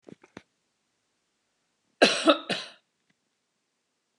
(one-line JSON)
{"cough_length": "4.2 s", "cough_amplitude": 20461, "cough_signal_mean_std_ratio": 0.22, "survey_phase": "beta (2021-08-13 to 2022-03-07)", "age": "45-64", "gender": "Female", "wearing_mask": "No", "symptom_runny_or_blocked_nose": true, "smoker_status": "Never smoked", "respiratory_condition_asthma": false, "respiratory_condition_other": false, "recruitment_source": "REACT", "submission_delay": "1 day", "covid_test_result": "Negative", "covid_test_method": "RT-qPCR", "influenza_a_test_result": "Unknown/Void", "influenza_b_test_result": "Unknown/Void"}